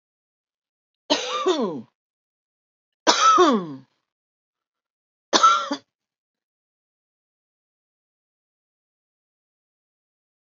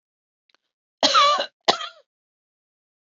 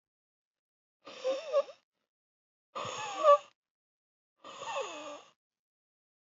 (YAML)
three_cough_length: 10.6 s
three_cough_amplitude: 31546
three_cough_signal_mean_std_ratio: 0.29
cough_length: 3.2 s
cough_amplitude: 26883
cough_signal_mean_std_ratio: 0.32
exhalation_length: 6.3 s
exhalation_amplitude: 8683
exhalation_signal_mean_std_ratio: 0.28
survey_phase: beta (2021-08-13 to 2022-03-07)
age: 45-64
gender: Female
wearing_mask: 'No'
symptom_none: true
smoker_status: Ex-smoker
respiratory_condition_asthma: false
respiratory_condition_other: false
recruitment_source: REACT
submission_delay: 1 day
covid_test_result: Negative
covid_test_method: RT-qPCR
influenza_a_test_result: Negative
influenza_b_test_result: Negative